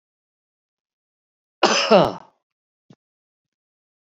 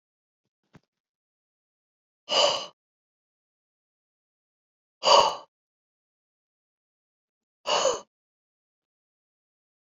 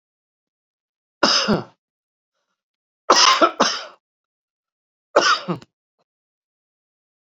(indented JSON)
{
  "cough_length": "4.2 s",
  "cough_amplitude": 28729,
  "cough_signal_mean_std_ratio": 0.24,
  "exhalation_length": "10.0 s",
  "exhalation_amplitude": 20451,
  "exhalation_signal_mean_std_ratio": 0.22,
  "three_cough_length": "7.3 s",
  "three_cough_amplitude": 32767,
  "three_cough_signal_mean_std_ratio": 0.31,
  "survey_phase": "beta (2021-08-13 to 2022-03-07)",
  "age": "65+",
  "gender": "Male",
  "wearing_mask": "No",
  "symptom_cough_any": true,
  "smoker_status": "Never smoked",
  "respiratory_condition_asthma": false,
  "respiratory_condition_other": false,
  "recruitment_source": "REACT",
  "submission_delay": "1 day",
  "covid_test_result": "Negative",
  "covid_test_method": "RT-qPCR"
}